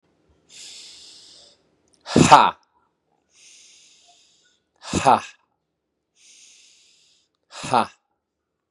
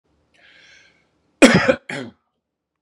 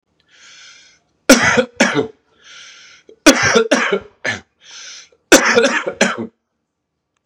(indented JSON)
{
  "exhalation_length": "8.7 s",
  "exhalation_amplitude": 32768,
  "exhalation_signal_mean_std_ratio": 0.22,
  "cough_length": "2.8 s",
  "cough_amplitude": 32768,
  "cough_signal_mean_std_ratio": 0.27,
  "three_cough_length": "7.3 s",
  "three_cough_amplitude": 32768,
  "three_cough_signal_mean_std_ratio": 0.42,
  "survey_phase": "beta (2021-08-13 to 2022-03-07)",
  "age": "18-44",
  "gender": "Male",
  "wearing_mask": "No",
  "symptom_cough_any": true,
  "symptom_shortness_of_breath": true,
  "symptom_sore_throat": true,
  "symptom_other": true,
  "smoker_status": "Never smoked",
  "respiratory_condition_asthma": true,
  "respiratory_condition_other": false,
  "recruitment_source": "Test and Trace",
  "submission_delay": "2 days",
  "covid_test_result": "Positive",
  "covid_test_method": "RT-qPCR",
  "covid_ct_value": 23.6,
  "covid_ct_gene": "ORF1ab gene",
  "covid_ct_mean": 24.1,
  "covid_viral_load": "12000 copies/ml",
  "covid_viral_load_category": "Low viral load (10K-1M copies/ml)"
}